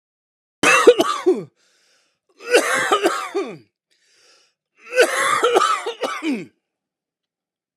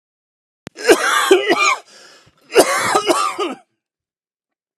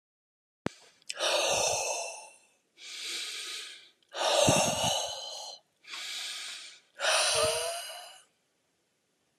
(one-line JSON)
{"three_cough_length": "7.8 s", "three_cough_amplitude": 32768, "three_cough_signal_mean_std_ratio": 0.46, "cough_length": "4.8 s", "cough_amplitude": 32768, "cough_signal_mean_std_ratio": 0.49, "exhalation_length": "9.4 s", "exhalation_amplitude": 8961, "exhalation_signal_mean_std_ratio": 0.56, "survey_phase": "alpha (2021-03-01 to 2021-08-12)", "age": "45-64", "gender": "Male", "wearing_mask": "No", "symptom_none": true, "smoker_status": "Ex-smoker", "respiratory_condition_asthma": false, "respiratory_condition_other": false, "recruitment_source": "REACT", "submission_delay": "6 days", "covid_test_result": "Negative", "covid_test_method": "RT-qPCR"}